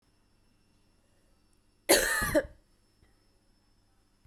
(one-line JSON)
{"cough_length": "4.3 s", "cough_amplitude": 11688, "cough_signal_mean_std_ratio": 0.27, "survey_phase": "beta (2021-08-13 to 2022-03-07)", "age": "18-44", "gender": "Female", "wearing_mask": "No", "symptom_fatigue": true, "smoker_status": "Ex-smoker", "respiratory_condition_asthma": false, "respiratory_condition_other": false, "recruitment_source": "REACT", "submission_delay": "0 days", "covid_test_result": "Negative", "covid_test_method": "RT-qPCR"}